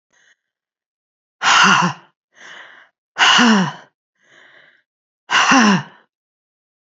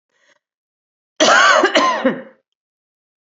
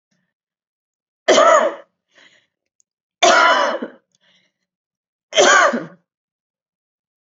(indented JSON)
{
  "exhalation_length": "6.9 s",
  "exhalation_amplitude": 32412,
  "exhalation_signal_mean_std_ratio": 0.4,
  "cough_length": "3.3 s",
  "cough_amplitude": 32768,
  "cough_signal_mean_std_ratio": 0.44,
  "three_cough_length": "7.3 s",
  "three_cough_amplitude": 31061,
  "three_cough_signal_mean_std_ratio": 0.37,
  "survey_phase": "beta (2021-08-13 to 2022-03-07)",
  "age": "45-64",
  "gender": "Female",
  "wearing_mask": "No",
  "symptom_other": true,
  "smoker_status": "Never smoked",
  "respiratory_condition_asthma": true,
  "respiratory_condition_other": false,
  "recruitment_source": "REACT",
  "submission_delay": "1 day",
  "covid_test_result": "Negative",
  "covid_test_method": "RT-qPCR",
  "influenza_a_test_result": "Negative",
  "influenza_b_test_result": "Negative"
}